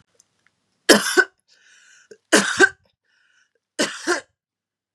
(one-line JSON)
{"three_cough_length": "4.9 s", "three_cough_amplitude": 32768, "three_cough_signal_mean_std_ratio": 0.3, "survey_phase": "beta (2021-08-13 to 2022-03-07)", "age": "45-64", "gender": "Female", "wearing_mask": "No", "symptom_runny_or_blocked_nose": true, "symptom_sore_throat": true, "symptom_fatigue": true, "symptom_headache": true, "symptom_change_to_sense_of_smell_or_taste": true, "smoker_status": "Ex-smoker", "respiratory_condition_asthma": false, "respiratory_condition_other": false, "recruitment_source": "Test and Trace", "submission_delay": "2 days", "covid_test_result": "Positive", "covid_test_method": "RT-qPCR", "covid_ct_value": 22.6, "covid_ct_gene": "ORF1ab gene", "covid_ct_mean": 23.3, "covid_viral_load": "22000 copies/ml", "covid_viral_load_category": "Low viral load (10K-1M copies/ml)"}